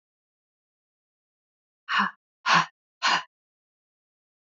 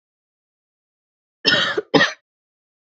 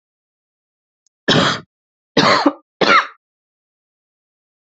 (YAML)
exhalation_length: 4.5 s
exhalation_amplitude: 14033
exhalation_signal_mean_std_ratio: 0.28
cough_length: 3.0 s
cough_amplitude: 29868
cough_signal_mean_std_ratio: 0.31
three_cough_length: 4.7 s
three_cough_amplitude: 31779
three_cough_signal_mean_std_ratio: 0.34
survey_phase: beta (2021-08-13 to 2022-03-07)
age: 18-44
gender: Female
wearing_mask: 'No'
symptom_cough_any: true
symptom_runny_or_blocked_nose: true
symptom_diarrhoea: true
symptom_fatigue: true
symptom_change_to_sense_of_smell_or_taste: true
symptom_other: true
symptom_onset: 4 days
smoker_status: Never smoked
respiratory_condition_asthma: false
respiratory_condition_other: false
recruitment_source: Test and Trace
submission_delay: 1 day
covid_test_result: Positive
covid_test_method: RT-qPCR
covid_ct_value: 19.2
covid_ct_gene: ORF1ab gene
covid_ct_mean: 20.5
covid_viral_load: 190000 copies/ml
covid_viral_load_category: Low viral load (10K-1M copies/ml)